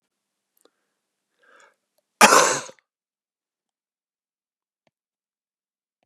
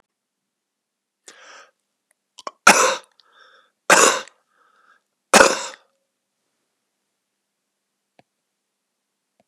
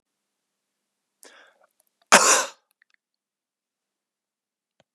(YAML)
cough_length: 6.1 s
cough_amplitude: 32768
cough_signal_mean_std_ratio: 0.18
three_cough_length: 9.5 s
three_cough_amplitude: 32768
three_cough_signal_mean_std_ratio: 0.22
exhalation_length: 4.9 s
exhalation_amplitude: 32756
exhalation_signal_mean_std_ratio: 0.19
survey_phase: beta (2021-08-13 to 2022-03-07)
age: 45-64
gender: Male
wearing_mask: 'No'
symptom_none: true
smoker_status: Ex-smoker
respiratory_condition_asthma: false
respiratory_condition_other: false
recruitment_source: REACT
submission_delay: 1 day
covid_test_result: Negative
covid_test_method: RT-qPCR
influenza_a_test_result: Negative
influenza_b_test_result: Negative